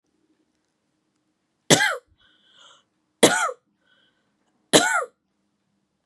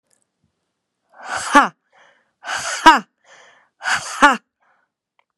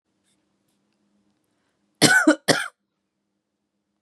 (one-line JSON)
{"three_cough_length": "6.1 s", "three_cough_amplitude": 32767, "three_cough_signal_mean_std_ratio": 0.26, "exhalation_length": "5.4 s", "exhalation_amplitude": 32768, "exhalation_signal_mean_std_ratio": 0.29, "cough_length": "4.0 s", "cough_amplitude": 32683, "cough_signal_mean_std_ratio": 0.26, "survey_phase": "beta (2021-08-13 to 2022-03-07)", "age": "18-44", "gender": "Female", "wearing_mask": "No", "symptom_none": true, "smoker_status": "Never smoked", "respiratory_condition_asthma": false, "respiratory_condition_other": false, "recruitment_source": "REACT", "submission_delay": "3 days", "covid_test_result": "Negative", "covid_test_method": "RT-qPCR", "influenza_a_test_result": "Unknown/Void", "influenza_b_test_result": "Unknown/Void"}